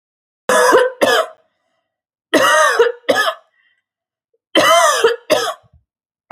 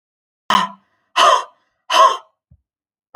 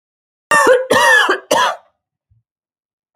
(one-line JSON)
{"three_cough_length": "6.3 s", "three_cough_amplitude": 30367, "three_cough_signal_mean_std_ratio": 0.52, "exhalation_length": "3.2 s", "exhalation_amplitude": 28631, "exhalation_signal_mean_std_ratio": 0.38, "cough_length": "3.2 s", "cough_amplitude": 32768, "cough_signal_mean_std_ratio": 0.5, "survey_phase": "alpha (2021-03-01 to 2021-08-12)", "age": "45-64", "gender": "Female", "wearing_mask": "No", "symptom_none": true, "smoker_status": "Ex-smoker", "respiratory_condition_asthma": false, "respiratory_condition_other": false, "recruitment_source": "REACT", "submission_delay": "2 days", "covid_test_result": "Negative", "covid_test_method": "RT-qPCR"}